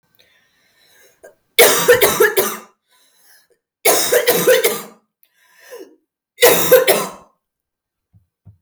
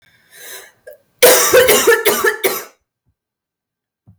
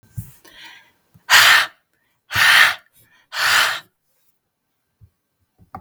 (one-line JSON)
{"three_cough_length": "8.6 s", "three_cough_amplitude": 32768, "three_cough_signal_mean_std_ratio": 0.43, "cough_length": "4.2 s", "cough_amplitude": 32768, "cough_signal_mean_std_ratio": 0.47, "exhalation_length": "5.8 s", "exhalation_amplitude": 32768, "exhalation_signal_mean_std_ratio": 0.37, "survey_phase": "beta (2021-08-13 to 2022-03-07)", "age": "18-44", "gender": "Female", "wearing_mask": "No", "symptom_cough_any": true, "symptom_fatigue": true, "smoker_status": "Current smoker (e-cigarettes or vapes only)", "respiratory_condition_asthma": false, "respiratory_condition_other": false, "recruitment_source": "Test and Trace", "submission_delay": "0 days", "covid_test_result": "Negative", "covid_test_method": "LFT"}